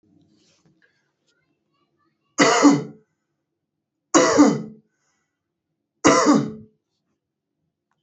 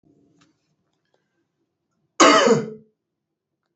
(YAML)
three_cough_length: 8.0 s
three_cough_amplitude: 28053
three_cough_signal_mean_std_ratio: 0.32
cough_length: 3.8 s
cough_amplitude: 28553
cough_signal_mean_std_ratio: 0.28
survey_phase: alpha (2021-03-01 to 2021-08-12)
age: 18-44
gender: Male
wearing_mask: 'No'
symptom_none: true
symptom_onset: 4 days
smoker_status: Never smoked
respiratory_condition_asthma: false
respiratory_condition_other: false
recruitment_source: REACT
submission_delay: 3 days
covid_test_result: Negative
covid_test_method: RT-qPCR